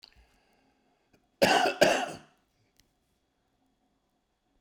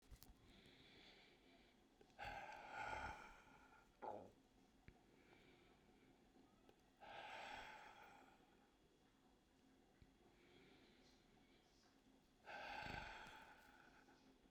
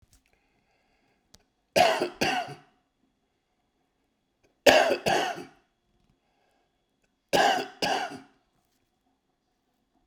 {"cough_length": "4.6 s", "cough_amplitude": 14460, "cough_signal_mean_std_ratio": 0.28, "exhalation_length": "14.5 s", "exhalation_amplitude": 458, "exhalation_signal_mean_std_ratio": 0.59, "three_cough_length": "10.1 s", "three_cough_amplitude": 32767, "three_cough_signal_mean_std_ratio": 0.32, "survey_phase": "beta (2021-08-13 to 2022-03-07)", "age": "65+", "gender": "Male", "wearing_mask": "No", "symptom_none": true, "smoker_status": "Ex-smoker", "respiratory_condition_asthma": false, "respiratory_condition_other": true, "recruitment_source": "REACT", "submission_delay": "0 days", "covid_test_result": "Negative", "covid_test_method": "RT-qPCR"}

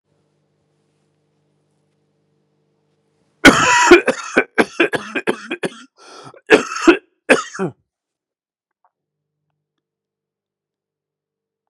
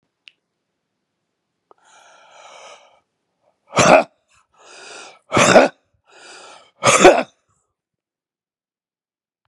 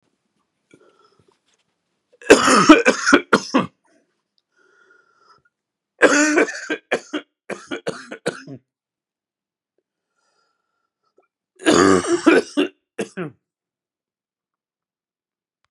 {"cough_length": "11.7 s", "cough_amplitude": 32768, "cough_signal_mean_std_ratio": 0.28, "exhalation_length": "9.5 s", "exhalation_amplitude": 32768, "exhalation_signal_mean_std_ratio": 0.26, "three_cough_length": "15.7 s", "three_cough_amplitude": 32768, "three_cough_signal_mean_std_ratio": 0.31, "survey_phase": "beta (2021-08-13 to 2022-03-07)", "age": "45-64", "gender": "Male", "wearing_mask": "No", "symptom_cough_any": true, "symptom_runny_or_blocked_nose": true, "symptom_fatigue": true, "symptom_change_to_sense_of_smell_or_taste": true, "symptom_loss_of_taste": true, "smoker_status": "Never smoked", "respiratory_condition_asthma": true, "respiratory_condition_other": false, "recruitment_source": "Test and Trace", "submission_delay": "1 day", "covid_test_result": "Positive", "covid_test_method": "RT-qPCR", "covid_ct_value": 19.3, "covid_ct_gene": "ORF1ab gene", "covid_ct_mean": 19.7, "covid_viral_load": "350000 copies/ml", "covid_viral_load_category": "Low viral load (10K-1M copies/ml)"}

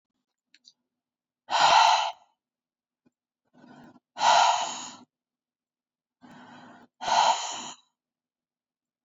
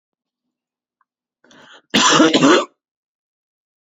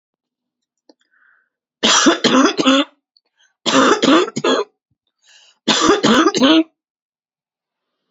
{"exhalation_length": "9.0 s", "exhalation_amplitude": 14551, "exhalation_signal_mean_std_ratio": 0.34, "cough_length": "3.8 s", "cough_amplitude": 29212, "cough_signal_mean_std_ratio": 0.35, "three_cough_length": "8.1 s", "three_cough_amplitude": 29606, "three_cough_signal_mean_std_ratio": 0.48, "survey_phase": "beta (2021-08-13 to 2022-03-07)", "age": "45-64", "gender": "Female", "wearing_mask": "No", "symptom_cough_any": true, "symptom_runny_or_blocked_nose": true, "symptom_fatigue": true, "symptom_headache": true, "symptom_change_to_sense_of_smell_or_taste": true, "symptom_onset": "2 days", "smoker_status": "Never smoked", "respiratory_condition_asthma": false, "respiratory_condition_other": false, "recruitment_source": "Test and Trace", "submission_delay": "2 days", "covid_test_result": "Positive", "covid_test_method": "ePCR"}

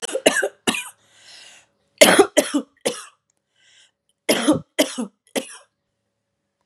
{"three_cough_length": "6.7 s", "three_cough_amplitude": 32768, "three_cough_signal_mean_std_ratio": 0.33, "survey_phase": "beta (2021-08-13 to 2022-03-07)", "age": "45-64", "gender": "Female", "wearing_mask": "No", "symptom_cough_any": true, "symptom_runny_or_blocked_nose": true, "symptom_onset": "7 days", "smoker_status": "Never smoked", "respiratory_condition_asthma": false, "respiratory_condition_other": false, "recruitment_source": "REACT", "submission_delay": "2 days", "covid_test_result": "Negative", "covid_test_method": "RT-qPCR", "influenza_a_test_result": "Negative", "influenza_b_test_result": "Negative"}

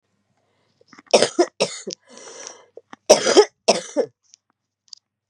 {"cough_length": "5.3 s", "cough_amplitude": 32768, "cough_signal_mean_std_ratio": 0.3, "survey_phase": "beta (2021-08-13 to 2022-03-07)", "age": "45-64", "gender": "Female", "wearing_mask": "No", "symptom_cough_any": true, "symptom_runny_or_blocked_nose": true, "symptom_shortness_of_breath": true, "symptom_fatigue": true, "symptom_headache": true, "smoker_status": "Ex-smoker", "respiratory_condition_asthma": false, "respiratory_condition_other": true, "recruitment_source": "Test and Trace", "submission_delay": "1 day", "covid_test_result": "Positive", "covid_test_method": "RT-qPCR", "covid_ct_value": 14.3, "covid_ct_gene": "ORF1ab gene"}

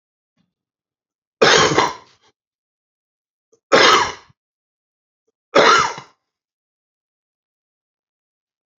{"three_cough_length": "8.8 s", "three_cough_amplitude": 32768, "three_cough_signal_mean_std_ratio": 0.3, "survey_phase": "beta (2021-08-13 to 2022-03-07)", "age": "45-64", "gender": "Male", "wearing_mask": "No", "symptom_cough_any": true, "symptom_runny_or_blocked_nose": true, "smoker_status": "Prefer not to say", "respiratory_condition_asthma": false, "respiratory_condition_other": false, "recruitment_source": "REACT", "submission_delay": "1 day", "covid_test_result": "Negative", "covid_test_method": "RT-qPCR"}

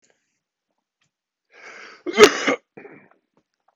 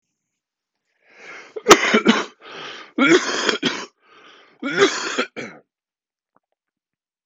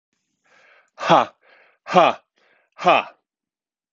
{"cough_length": "3.8 s", "cough_amplitude": 32768, "cough_signal_mean_std_ratio": 0.21, "three_cough_length": "7.3 s", "three_cough_amplitude": 32768, "three_cough_signal_mean_std_ratio": 0.37, "exhalation_length": "3.9 s", "exhalation_amplitude": 30689, "exhalation_signal_mean_std_ratio": 0.29, "survey_phase": "beta (2021-08-13 to 2022-03-07)", "age": "45-64", "gender": "Male", "wearing_mask": "No", "symptom_cough_any": true, "symptom_runny_or_blocked_nose": true, "symptom_sore_throat": true, "smoker_status": "Never smoked", "respiratory_condition_asthma": false, "respiratory_condition_other": false, "recruitment_source": "Test and Trace", "submission_delay": "2 days", "covid_test_result": "Positive", "covid_test_method": "RT-qPCR", "covid_ct_value": 25.8, "covid_ct_gene": "N gene"}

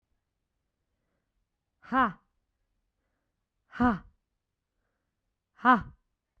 {"exhalation_length": "6.4 s", "exhalation_amplitude": 11298, "exhalation_signal_mean_std_ratio": 0.22, "survey_phase": "beta (2021-08-13 to 2022-03-07)", "age": "18-44", "gender": "Female", "wearing_mask": "No", "symptom_none": true, "smoker_status": "Never smoked", "respiratory_condition_asthma": false, "respiratory_condition_other": false, "recruitment_source": "REACT", "submission_delay": "3 days", "covid_test_result": "Negative", "covid_test_method": "RT-qPCR", "influenza_a_test_result": "Unknown/Void", "influenza_b_test_result": "Unknown/Void"}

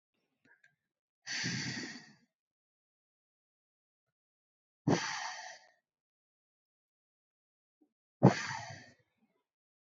{"exhalation_length": "10.0 s", "exhalation_amplitude": 9888, "exhalation_signal_mean_std_ratio": 0.23, "survey_phase": "beta (2021-08-13 to 2022-03-07)", "age": "18-44", "gender": "Female", "wearing_mask": "No", "symptom_none": true, "smoker_status": "Never smoked", "respiratory_condition_asthma": false, "respiratory_condition_other": false, "recruitment_source": "REACT", "submission_delay": "1 day", "covid_test_result": "Negative", "covid_test_method": "RT-qPCR", "influenza_a_test_result": "Negative", "influenza_b_test_result": "Negative"}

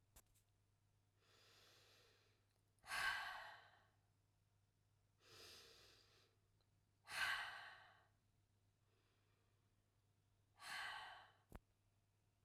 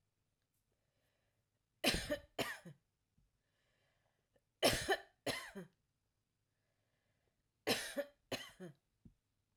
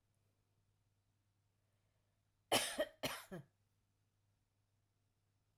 {"exhalation_length": "12.4 s", "exhalation_amplitude": 793, "exhalation_signal_mean_std_ratio": 0.35, "three_cough_length": "9.6 s", "three_cough_amplitude": 4282, "three_cough_signal_mean_std_ratio": 0.29, "cough_length": "5.6 s", "cough_amplitude": 3258, "cough_signal_mean_std_ratio": 0.23, "survey_phase": "alpha (2021-03-01 to 2021-08-12)", "age": "45-64", "gender": "Female", "wearing_mask": "No", "symptom_none": true, "smoker_status": "Ex-smoker", "respiratory_condition_asthma": false, "respiratory_condition_other": false, "recruitment_source": "REACT", "submission_delay": "5 days", "covid_test_result": "Negative", "covid_test_method": "RT-qPCR"}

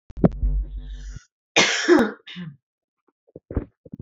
{"cough_length": "4.0 s", "cough_amplitude": 27337, "cough_signal_mean_std_ratio": 0.43, "survey_phase": "alpha (2021-03-01 to 2021-08-12)", "age": "18-44", "gender": "Female", "wearing_mask": "No", "symptom_shortness_of_breath": true, "symptom_fatigue": true, "smoker_status": "Ex-smoker", "respiratory_condition_asthma": false, "respiratory_condition_other": false, "recruitment_source": "REACT", "submission_delay": "1 day", "covid_test_result": "Negative", "covid_test_method": "RT-qPCR"}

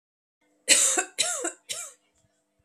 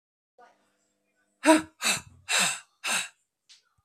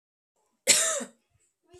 {"three_cough_length": "2.6 s", "three_cough_amplitude": 24805, "three_cough_signal_mean_std_ratio": 0.4, "exhalation_length": "3.8 s", "exhalation_amplitude": 22285, "exhalation_signal_mean_std_ratio": 0.34, "cough_length": "1.8 s", "cough_amplitude": 18963, "cough_signal_mean_std_ratio": 0.33, "survey_phase": "beta (2021-08-13 to 2022-03-07)", "age": "18-44", "gender": "Female", "wearing_mask": "No", "symptom_runny_or_blocked_nose": true, "smoker_status": "Ex-smoker", "respiratory_condition_asthma": false, "respiratory_condition_other": false, "recruitment_source": "Test and Trace", "submission_delay": "2 days", "covid_test_result": "Positive", "covid_test_method": "ePCR"}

